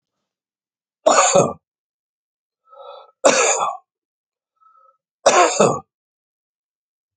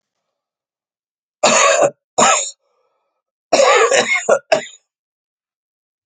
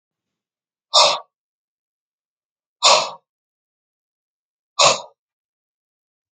three_cough_length: 7.2 s
three_cough_amplitude: 29232
three_cough_signal_mean_std_ratio: 0.35
cough_length: 6.1 s
cough_amplitude: 32768
cough_signal_mean_std_ratio: 0.43
exhalation_length: 6.3 s
exhalation_amplitude: 31870
exhalation_signal_mean_std_ratio: 0.25
survey_phase: alpha (2021-03-01 to 2021-08-12)
age: 45-64
gender: Male
wearing_mask: 'No'
symptom_new_continuous_cough: true
symptom_fatigue: true
symptom_onset: 10 days
smoker_status: Never smoked
respiratory_condition_asthma: false
respiratory_condition_other: false
recruitment_source: Test and Trace
submission_delay: 2 days
covid_test_result: Positive
covid_test_method: RT-qPCR
covid_ct_value: 16.9
covid_ct_gene: ORF1ab gene
covid_ct_mean: 17.4
covid_viral_load: 2000000 copies/ml
covid_viral_load_category: High viral load (>1M copies/ml)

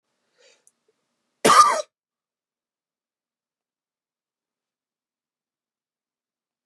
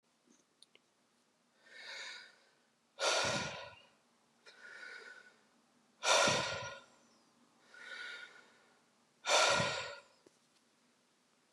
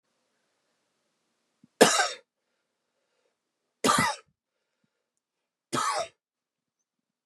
cough_length: 6.7 s
cough_amplitude: 27424
cough_signal_mean_std_ratio: 0.18
exhalation_length: 11.5 s
exhalation_amplitude: 4912
exhalation_signal_mean_std_ratio: 0.36
three_cough_length: 7.3 s
three_cough_amplitude: 28270
three_cough_signal_mean_std_ratio: 0.25
survey_phase: beta (2021-08-13 to 2022-03-07)
age: 45-64
gender: Male
wearing_mask: 'No'
symptom_cough_any: true
symptom_runny_or_blocked_nose: true
symptom_sore_throat: true
symptom_fatigue: true
symptom_headache: true
symptom_loss_of_taste: true
symptom_onset: 3 days
smoker_status: Never smoked
respiratory_condition_asthma: false
respiratory_condition_other: false
recruitment_source: Test and Trace
submission_delay: 1 day
covid_test_result: Positive
covid_test_method: RT-qPCR
covid_ct_value: 18.2
covid_ct_gene: ORF1ab gene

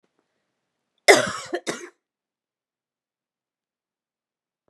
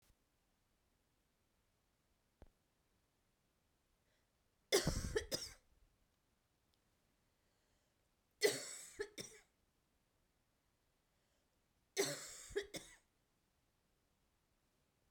cough_length: 4.7 s
cough_amplitude: 32768
cough_signal_mean_std_ratio: 0.18
three_cough_length: 15.1 s
three_cough_amplitude: 2980
three_cough_signal_mean_std_ratio: 0.24
survey_phase: beta (2021-08-13 to 2022-03-07)
age: 45-64
gender: Female
wearing_mask: 'No'
symptom_cough_any: true
symptom_runny_or_blocked_nose: true
symptom_abdominal_pain: true
symptom_diarrhoea: true
symptom_fatigue: true
symptom_fever_high_temperature: true
symptom_headache: true
symptom_change_to_sense_of_smell_or_taste: true
symptom_loss_of_taste: true
symptom_other: true
symptom_onset: 3 days
smoker_status: Never smoked
respiratory_condition_asthma: false
respiratory_condition_other: false
recruitment_source: Test and Trace
submission_delay: 2 days
covid_test_result: Positive
covid_test_method: RT-qPCR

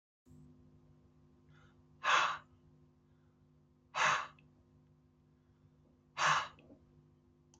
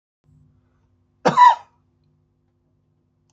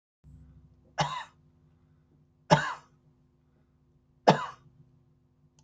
exhalation_length: 7.6 s
exhalation_amplitude: 4978
exhalation_signal_mean_std_ratio: 0.31
cough_length: 3.3 s
cough_amplitude: 26443
cough_signal_mean_std_ratio: 0.23
three_cough_length: 5.6 s
three_cough_amplitude: 22200
three_cough_signal_mean_std_ratio: 0.22
survey_phase: alpha (2021-03-01 to 2021-08-12)
age: 65+
gender: Male
wearing_mask: 'No'
symptom_cough_any: true
symptom_change_to_sense_of_smell_or_taste: true
symptom_loss_of_taste: true
smoker_status: Never smoked
respiratory_condition_asthma: true
respiratory_condition_other: false
recruitment_source: Test and Trace
submission_delay: 2 days
covid_test_result: Positive
covid_test_method: RT-qPCR
covid_ct_value: 21.5
covid_ct_gene: ORF1ab gene
covid_ct_mean: 22.1
covid_viral_load: 57000 copies/ml
covid_viral_load_category: Low viral load (10K-1M copies/ml)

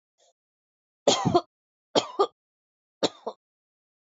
three_cough_length: 4.1 s
three_cough_amplitude: 20843
three_cough_signal_mean_std_ratio: 0.27
survey_phase: alpha (2021-03-01 to 2021-08-12)
age: 45-64
gender: Female
wearing_mask: 'No'
symptom_none: true
smoker_status: Ex-smoker
respiratory_condition_asthma: false
respiratory_condition_other: false
recruitment_source: REACT
submission_delay: 2 days
covid_test_result: Negative
covid_test_method: RT-qPCR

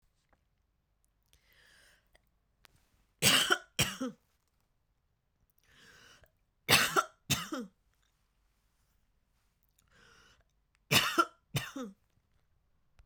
three_cough_length: 13.1 s
three_cough_amplitude: 10191
three_cough_signal_mean_std_ratio: 0.27
survey_phase: beta (2021-08-13 to 2022-03-07)
age: 18-44
gender: Female
wearing_mask: 'No'
symptom_cough_any: true
symptom_runny_or_blocked_nose: true
symptom_sore_throat: true
symptom_abdominal_pain: true
symptom_fatigue: true
symptom_headache: true
smoker_status: Never smoked
respiratory_condition_asthma: false
respiratory_condition_other: false
recruitment_source: Test and Trace
submission_delay: 2 days
covid_test_result: Positive
covid_test_method: RT-qPCR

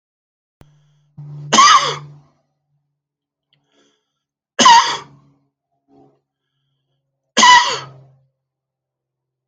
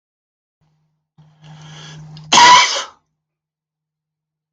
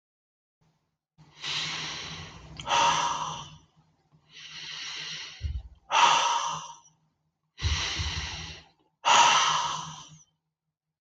three_cough_length: 9.5 s
three_cough_amplitude: 32768
three_cough_signal_mean_std_ratio: 0.29
cough_length: 4.5 s
cough_amplitude: 32768
cough_signal_mean_std_ratio: 0.29
exhalation_length: 11.0 s
exhalation_amplitude: 15305
exhalation_signal_mean_std_ratio: 0.49
survey_phase: alpha (2021-03-01 to 2021-08-12)
age: 45-64
gender: Male
wearing_mask: 'No'
symptom_none: true
smoker_status: Never smoked
respiratory_condition_asthma: true
respiratory_condition_other: false
recruitment_source: REACT
submission_delay: 3 days
covid_test_result: Negative
covid_test_method: RT-qPCR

